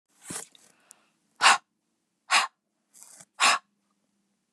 {
  "exhalation_length": "4.5 s",
  "exhalation_amplitude": 19156,
  "exhalation_signal_mean_std_ratio": 0.27,
  "survey_phase": "beta (2021-08-13 to 2022-03-07)",
  "age": "65+",
  "gender": "Female",
  "wearing_mask": "No",
  "symptom_none": true,
  "symptom_onset": "13 days",
  "smoker_status": "Never smoked",
  "respiratory_condition_asthma": false,
  "respiratory_condition_other": true,
  "recruitment_source": "REACT",
  "submission_delay": "0 days",
  "covid_test_result": "Negative",
  "covid_test_method": "RT-qPCR",
  "influenza_a_test_result": "Negative",
  "influenza_b_test_result": "Negative"
}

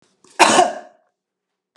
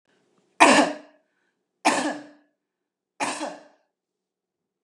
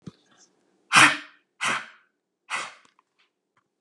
{
  "cough_length": "1.8 s",
  "cough_amplitude": 32768,
  "cough_signal_mean_std_ratio": 0.34,
  "three_cough_length": "4.8 s",
  "three_cough_amplitude": 32061,
  "three_cough_signal_mean_std_ratio": 0.29,
  "exhalation_length": "3.8 s",
  "exhalation_amplitude": 27213,
  "exhalation_signal_mean_std_ratio": 0.26,
  "survey_phase": "beta (2021-08-13 to 2022-03-07)",
  "age": "65+",
  "gender": "Female",
  "wearing_mask": "No",
  "symptom_none": true,
  "smoker_status": "Never smoked",
  "respiratory_condition_asthma": false,
  "respiratory_condition_other": false,
  "recruitment_source": "REACT",
  "submission_delay": "1 day",
  "covid_test_result": "Negative",
  "covid_test_method": "RT-qPCR",
  "influenza_a_test_result": "Negative",
  "influenza_b_test_result": "Negative"
}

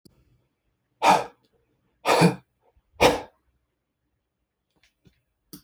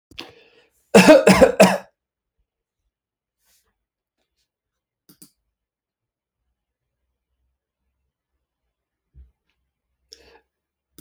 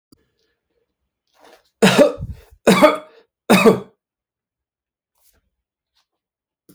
{
  "exhalation_length": "5.6 s",
  "exhalation_amplitude": 21247,
  "exhalation_signal_mean_std_ratio": 0.27,
  "cough_length": "11.0 s",
  "cough_amplitude": 31229,
  "cough_signal_mean_std_ratio": 0.2,
  "three_cough_length": "6.7 s",
  "three_cough_amplitude": 32767,
  "three_cough_signal_mean_std_ratio": 0.29,
  "survey_phase": "alpha (2021-03-01 to 2021-08-12)",
  "age": "45-64",
  "gender": "Male",
  "wearing_mask": "No",
  "symptom_none": true,
  "smoker_status": "Ex-smoker",
  "respiratory_condition_asthma": false,
  "respiratory_condition_other": false,
  "recruitment_source": "REACT",
  "submission_delay": "2 days",
  "covid_test_result": "Negative",
  "covid_test_method": "RT-qPCR"
}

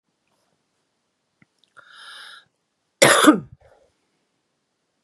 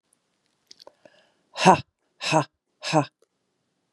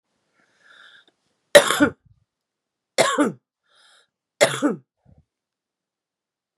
{
  "cough_length": "5.0 s",
  "cough_amplitude": 32767,
  "cough_signal_mean_std_ratio": 0.22,
  "exhalation_length": "3.9 s",
  "exhalation_amplitude": 31014,
  "exhalation_signal_mean_std_ratio": 0.26,
  "three_cough_length": "6.6 s",
  "three_cough_amplitude": 32768,
  "three_cough_signal_mean_std_ratio": 0.25,
  "survey_phase": "beta (2021-08-13 to 2022-03-07)",
  "age": "45-64",
  "gender": "Female",
  "wearing_mask": "No",
  "symptom_runny_or_blocked_nose": true,
  "symptom_sore_throat": true,
  "symptom_fatigue": true,
  "symptom_fever_high_temperature": true,
  "symptom_headache": true,
  "symptom_change_to_sense_of_smell_or_taste": true,
  "symptom_loss_of_taste": true,
  "symptom_onset": "7 days",
  "smoker_status": "Ex-smoker",
  "respiratory_condition_asthma": false,
  "respiratory_condition_other": false,
  "recruitment_source": "Test and Trace",
  "submission_delay": "2 days",
  "covid_test_result": "Positive",
  "covid_test_method": "RT-qPCR",
  "covid_ct_value": 25.6,
  "covid_ct_gene": "ORF1ab gene"
}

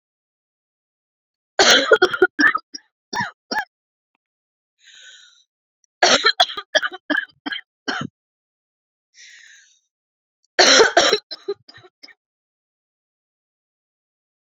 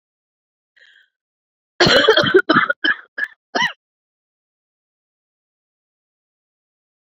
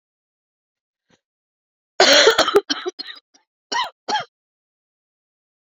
{
  "three_cough_length": "14.4 s",
  "three_cough_amplitude": 32669,
  "three_cough_signal_mean_std_ratio": 0.3,
  "exhalation_length": "7.2 s",
  "exhalation_amplitude": 30300,
  "exhalation_signal_mean_std_ratio": 0.3,
  "cough_length": "5.7 s",
  "cough_amplitude": 30750,
  "cough_signal_mean_std_ratio": 0.3,
  "survey_phase": "beta (2021-08-13 to 2022-03-07)",
  "age": "45-64",
  "gender": "Female",
  "wearing_mask": "No",
  "symptom_cough_any": true,
  "symptom_runny_or_blocked_nose": true,
  "symptom_shortness_of_breath": true,
  "symptom_sore_throat": true,
  "symptom_fatigue": true,
  "symptom_headache": true,
  "symptom_change_to_sense_of_smell_or_taste": true,
  "symptom_loss_of_taste": true,
  "symptom_other": true,
  "symptom_onset": "4 days",
  "smoker_status": "Never smoked",
  "respiratory_condition_asthma": false,
  "respiratory_condition_other": false,
  "recruitment_source": "Test and Trace",
  "submission_delay": "2 days",
  "covid_test_result": "Positive",
  "covid_test_method": "RT-qPCR"
}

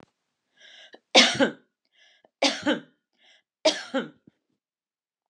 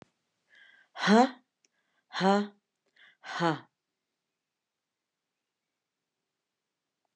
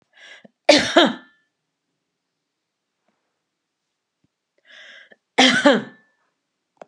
{
  "three_cough_length": "5.3 s",
  "three_cough_amplitude": 27421,
  "three_cough_signal_mean_std_ratio": 0.29,
  "exhalation_length": "7.2 s",
  "exhalation_amplitude": 11980,
  "exhalation_signal_mean_std_ratio": 0.24,
  "cough_length": "6.9 s",
  "cough_amplitude": 32768,
  "cough_signal_mean_std_ratio": 0.26,
  "survey_phase": "alpha (2021-03-01 to 2021-08-12)",
  "age": "45-64",
  "gender": "Female",
  "wearing_mask": "No",
  "symptom_none": true,
  "smoker_status": "Never smoked",
  "respiratory_condition_asthma": false,
  "respiratory_condition_other": false,
  "recruitment_source": "REACT",
  "submission_delay": "2 days",
  "covid_test_result": "Negative",
  "covid_test_method": "RT-qPCR"
}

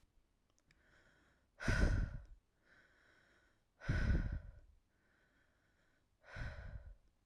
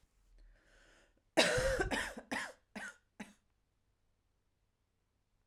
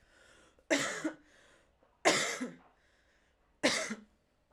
{
  "exhalation_length": "7.3 s",
  "exhalation_amplitude": 3545,
  "exhalation_signal_mean_std_ratio": 0.37,
  "cough_length": "5.5 s",
  "cough_amplitude": 6375,
  "cough_signal_mean_std_ratio": 0.34,
  "three_cough_length": "4.5 s",
  "three_cough_amplitude": 10104,
  "three_cough_signal_mean_std_ratio": 0.38,
  "survey_phase": "alpha (2021-03-01 to 2021-08-12)",
  "age": "18-44",
  "gender": "Female",
  "wearing_mask": "No",
  "symptom_none": true,
  "smoker_status": "Current smoker (11 or more cigarettes per day)",
  "respiratory_condition_asthma": false,
  "respiratory_condition_other": false,
  "recruitment_source": "REACT",
  "submission_delay": "1 day",
  "covid_test_result": "Negative",
  "covid_test_method": "RT-qPCR"
}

